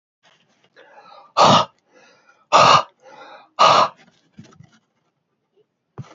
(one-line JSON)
{"exhalation_length": "6.1 s", "exhalation_amplitude": 29111, "exhalation_signal_mean_std_ratio": 0.32, "survey_phase": "beta (2021-08-13 to 2022-03-07)", "age": "45-64", "gender": "Male", "wearing_mask": "Yes", "symptom_cough_any": true, "symptom_runny_or_blocked_nose": true, "symptom_shortness_of_breath": true, "symptom_sore_throat": true, "symptom_abdominal_pain": true, "symptom_headache": true, "symptom_onset": "7 days", "smoker_status": "Ex-smoker", "respiratory_condition_asthma": false, "respiratory_condition_other": false, "recruitment_source": "Test and Trace", "submission_delay": "2 days", "covid_test_result": "Positive", "covid_test_method": "RT-qPCR", "covid_ct_value": 24.6, "covid_ct_gene": "N gene"}